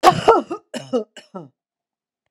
{
  "cough_length": "2.3 s",
  "cough_amplitude": 32768,
  "cough_signal_mean_std_ratio": 0.34,
  "survey_phase": "beta (2021-08-13 to 2022-03-07)",
  "age": "45-64",
  "gender": "Female",
  "wearing_mask": "No",
  "symptom_none": true,
  "smoker_status": "Ex-smoker",
  "respiratory_condition_asthma": false,
  "respiratory_condition_other": false,
  "recruitment_source": "REACT",
  "submission_delay": "1 day",
  "covid_test_result": "Negative",
  "covid_test_method": "RT-qPCR",
  "influenza_a_test_result": "Unknown/Void",
  "influenza_b_test_result": "Unknown/Void"
}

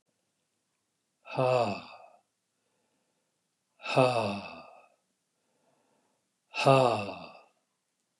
{
  "exhalation_length": "8.2 s",
  "exhalation_amplitude": 13636,
  "exhalation_signal_mean_std_ratio": 0.31,
  "survey_phase": "beta (2021-08-13 to 2022-03-07)",
  "age": "65+",
  "gender": "Male",
  "wearing_mask": "No",
  "symptom_none": true,
  "smoker_status": "Ex-smoker",
  "respiratory_condition_asthma": false,
  "respiratory_condition_other": false,
  "recruitment_source": "REACT",
  "submission_delay": "1 day",
  "covid_test_result": "Negative",
  "covid_test_method": "RT-qPCR",
  "influenza_a_test_result": "Negative",
  "influenza_b_test_result": "Negative"
}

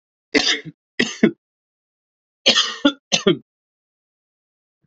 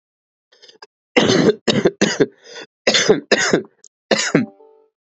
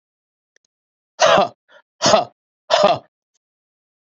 {
  "three_cough_length": "4.9 s",
  "three_cough_amplitude": 32353,
  "three_cough_signal_mean_std_ratio": 0.32,
  "cough_length": "5.1 s",
  "cough_amplitude": 32767,
  "cough_signal_mean_std_ratio": 0.46,
  "exhalation_length": "4.2 s",
  "exhalation_amplitude": 32768,
  "exhalation_signal_mean_std_ratio": 0.34,
  "survey_phase": "beta (2021-08-13 to 2022-03-07)",
  "age": "18-44",
  "gender": "Male",
  "wearing_mask": "No",
  "symptom_cough_any": true,
  "symptom_runny_or_blocked_nose": true,
  "symptom_sore_throat": true,
  "symptom_fever_high_temperature": true,
  "symptom_onset": "3 days",
  "smoker_status": "Ex-smoker",
  "respiratory_condition_asthma": false,
  "respiratory_condition_other": false,
  "recruitment_source": "Test and Trace",
  "submission_delay": "1 day",
  "covid_test_result": "Positive",
  "covid_test_method": "RT-qPCR",
  "covid_ct_value": 22.4,
  "covid_ct_gene": "ORF1ab gene",
  "covid_ct_mean": 24.8,
  "covid_viral_load": "7200 copies/ml",
  "covid_viral_load_category": "Minimal viral load (< 10K copies/ml)"
}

